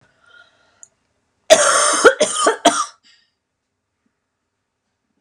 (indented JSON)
{
  "cough_length": "5.2 s",
  "cough_amplitude": 32768,
  "cough_signal_mean_std_ratio": 0.35,
  "survey_phase": "beta (2021-08-13 to 2022-03-07)",
  "age": "45-64",
  "gender": "Female",
  "wearing_mask": "No",
  "symptom_cough_any": true,
  "symptom_new_continuous_cough": true,
  "symptom_sore_throat": true,
  "symptom_abdominal_pain": true,
  "symptom_diarrhoea": true,
  "symptom_fatigue": true,
  "symptom_fever_high_temperature": true,
  "symptom_headache": true,
  "symptom_onset": "3 days",
  "smoker_status": "Never smoked",
  "respiratory_condition_asthma": true,
  "respiratory_condition_other": false,
  "recruitment_source": "Test and Trace",
  "submission_delay": "1 day",
  "covid_test_result": "Negative",
  "covid_test_method": "RT-qPCR"
}